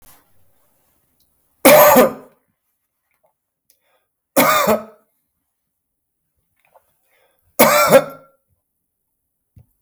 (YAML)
three_cough_length: 9.8 s
three_cough_amplitude: 32768
three_cough_signal_mean_std_ratio: 0.3
survey_phase: beta (2021-08-13 to 2022-03-07)
age: 65+
gender: Male
wearing_mask: 'No'
symptom_cough_any: true
symptom_onset: 12 days
smoker_status: Never smoked
respiratory_condition_asthma: false
respiratory_condition_other: false
recruitment_source: REACT
submission_delay: 0 days
covid_test_result: Positive
covid_test_method: RT-qPCR
covid_ct_value: 23.0
covid_ct_gene: E gene
influenza_a_test_result: Negative
influenza_b_test_result: Negative